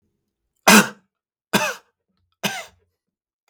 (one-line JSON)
{"three_cough_length": "3.5 s", "three_cough_amplitude": 32766, "three_cough_signal_mean_std_ratio": 0.25, "survey_phase": "beta (2021-08-13 to 2022-03-07)", "age": "65+", "gender": "Male", "wearing_mask": "No", "symptom_none": true, "smoker_status": "Ex-smoker", "respiratory_condition_asthma": false, "respiratory_condition_other": false, "recruitment_source": "REACT", "submission_delay": "2 days", "covid_test_result": "Negative", "covid_test_method": "RT-qPCR", "influenza_a_test_result": "Negative", "influenza_b_test_result": "Negative"}